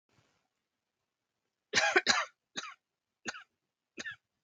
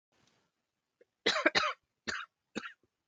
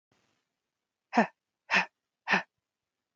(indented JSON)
{
  "three_cough_length": "4.4 s",
  "three_cough_amplitude": 12264,
  "three_cough_signal_mean_std_ratio": 0.27,
  "cough_length": "3.1 s",
  "cough_amplitude": 9866,
  "cough_signal_mean_std_ratio": 0.32,
  "exhalation_length": "3.2 s",
  "exhalation_amplitude": 10258,
  "exhalation_signal_mean_std_ratio": 0.26,
  "survey_phase": "beta (2021-08-13 to 2022-03-07)",
  "age": "18-44",
  "gender": "Female",
  "wearing_mask": "No",
  "symptom_none": true,
  "smoker_status": "Never smoked",
  "respiratory_condition_asthma": true,
  "respiratory_condition_other": false,
  "recruitment_source": "REACT",
  "submission_delay": "3 days",
  "covid_test_result": "Positive",
  "covid_test_method": "RT-qPCR",
  "covid_ct_value": 23.6,
  "covid_ct_gene": "E gene",
  "influenza_a_test_result": "Negative",
  "influenza_b_test_result": "Negative"
}